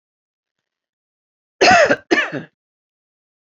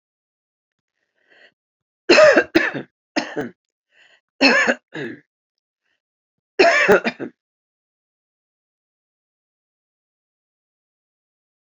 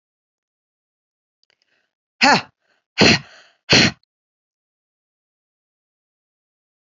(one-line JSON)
{"cough_length": "3.5 s", "cough_amplitude": 30855, "cough_signal_mean_std_ratio": 0.31, "three_cough_length": "11.8 s", "three_cough_amplitude": 29703, "three_cough_signal_mean_std_ratio": 0.28, "exhalation_length": "6.8 s", "exhalation_amplitude": 30592, "exhalation_signal_mean_std_ratio": 0.23, "survey_phase": "beta (2021-08-13 to 2022-03-07)", "age": "65+", "gender": "Female", "wearing_mask": "No", "symptom_none": true, "smoker_status": "Never smoked", "respiratory_condition_asthma": false, "respiratory_condition_other": false, "recruitment_source": "REACT", "submission_delay": "1 day", "covid_test_result": "Negative", "covid_test_method": "RT-qPCR", "influenza_a_test_result": "Negative", "influenza_b_test_result": "Negative"}